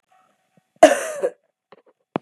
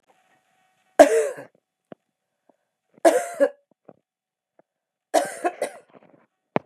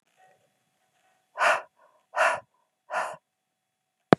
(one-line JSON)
{"cough_length": "2.2 s", "cough_amplitude": 32768, "cough_signal_mean_std_ratio": 0.24, "three_cough_length": "6.7 s", "three_cough_amplitude": 32768, "three_cough_signal_mean_std_ratio": 0.26, "exhalation_length": "4.2 s", "exhalation_amplitude": 32768, "exhalation_signal_mean_std_ratio": 0.26, "survey_phase": "beta (2021-08-13 to 2022-03-07)", "age": "45-64", "gender": "Female", "wearing_mask": "No", "symptom_cough_any": true, "symptom_runny_or_blocked_nose": true, "symptom_sore_throat": true, "symptom_fatigue": true, "symptom_headache": true, "symptom_change_to_sense_of_smell_or_taste": true, "symptom_loss_of_taste": true, "symptom_onset": "4 days", "smoker_status": "Ex-smoker", "respiratory_condition_asthma": false, "respiratory_condition_other": false, "recruitment_source": "Test and Trace", "submission_delay": "2 days", "covid_test_result": "Positive", "covid_test_method": "RT-qPCR", "covid_ct_value": 16.9, "covid_ct_gene": "ORF1ab gene", "covid_ct_mean": 18.8, "covid_viral_load": "660000 copies/ml", "covid_viral_load_category": "Low viral load (10K-1M copies/ml)"}